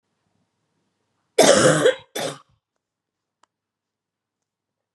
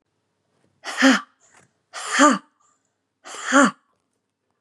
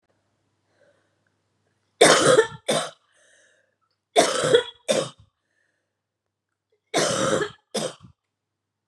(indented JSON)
{
  "cough_length": "4.9 s",
  "cough_amplitude": 32662,
  "cough_signal_mean_std_ratio": 0.28,
  "exhalation_length": "4.6 s",
  "exhalation_amplitude": 29784,
  "exhalation_signal_mean_std_ratio": 0.33,
  "three_cough_length": "8.9 s",
  "three_cough_amplitude": 28401,
  "three_cough_signal_mean_std_ratio": 0.35,
  "survey_phase": "beta (2021-08-13 to 2022-03-07)",
  "age": "45-64",
  "gender": "Female",
  "wearing_mask": "No",
  "symptom_cough_any": true,
  "symptom_runny_or_blocked_nose": true,
  "symptom_fatigue": true,
  "symptom_other": true,
  "symptom_onset": "3 days",
  "smoker_status": "Ex-smoker",
  "respiratory_condition_asthma": true,
  "respiratory_condition_other": false,
  "recruitment_source": "Test and Trace",
  "submission_delay": "2 days",
  "covid_test_result": "Positive",
  "covid_test_method": "RT-qPCR",
  "covid_ct_value": 18.9,
  "covid_ct_gene": "ORF1ab gene",
  "covid_ct_mean": 19.2,
  "covid_viral_load": "520000 copies/ml",
  "covid_viral_load_category": "Low viral load (10K-1M copies/ml)"
}